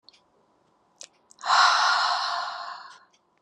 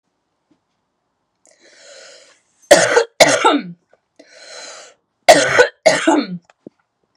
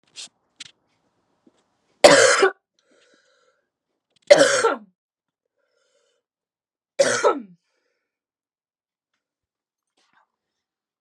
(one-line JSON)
{"exhalation_length": "3.4 s", "exhalation_amplitude": 16479, "exhalation_signal_mean_std_ratio": 0.48, "cough_length": "7.2 s", "cough_amplitude": 32768, "cough_signal_mean_std_ratio": 0.36, "three_cough_length": "11.0 s", "three_cough_amplitude": 32768, "three_cough_signal_mean_std_ratio": 0.24, "survey_phase": "alpha (2021-03-01 to 2021-08-12)", "age": "18-44", "gender": "Female", "wearing_mask": "No", "symptom_cough_any": true, "smoker_status": "Ex-smoker", "respiratory_condition_asthma": false, "respiratory_condition_other": false, "recruitment_source": "REACT", "submission_delay": "1 day", "covid_test_result": "Negative", "covid_test_method": "RT-qPCR"}